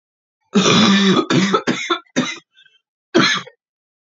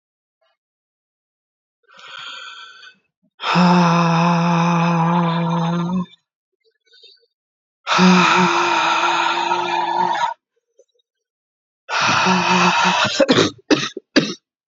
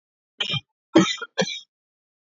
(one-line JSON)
{"cough_length": "4.1 s", "cough_amplitude": 32768, "cough_signal_mean_std_ratio": 0.56, "exhalation_length": "14.7 s", "exhalation_amplitude": 28402, "exhalation_signal_mean_std_ratio": 0.64, "three_cough_length": "2.3 s", "three_cough_amplitude": 24265, "three_cough_signal_mean_std_ratio": 0.33, "survey_phase": "beta (2021-08-13 to 2022-03-07)", "age": "18-44", "gender": "Female", "wearing_mask": "No", "symptom_cough_any": true, "symptom_runny_or_blocked_nose": true, "symptom_shortness_of_breath": true, "symptom_sore_throat": true, "symptom_fatigue": true, "symptom_onset": "6 days", "smoker_status": "Never smoked", "respiratory_condition_asthma": false, "respiratory_condition_other": false, "recruitment_source": "REACT", "submission_delay": "3 days", "covid_test_result": "Negative", "covid_test_method": "RT-qPCR", "influenza_a_test_result": "Unknown/Void", "influenza_b_test_result": "Unknown/Void"}